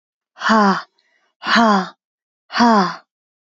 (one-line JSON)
{"exhalation_length": "3.4 s", "exhalation_amplitude": 32768, "exhalation_signal_mean_std_ratio": 0.48, "survey_phase": "beta (2021-08-13 to 2022-03-07)", "age": "18-44", "gender": "Female", "wearing_mask": "No", "symptom_cough_any": true, "symptom_runny_or_blocked_nose": true, "symptom_headache": true, "symptom_change_to_sense_of_smell_or_taste": true, "symptom_loss_of_taste": true, "symptom_onset": "6 days", "smoker_status": "Never smoked", "respiratory_condition_asthma": false, "respiratory_condition_other": false, "recruitment_source": "Test and Trace", "submission_delay": "2 days", "covid_test_result": "Positive", "covid_test_method": "RT-qPCR", "covid_ct_value": 16.7, "covid_ct_gene": "ORF1ab gene", "covid_ct_mean": 17.2, "covid_viral_load": "2400000 copies/ml", "covid_viral_load_category": "High viral load (>1M copies/ml)"}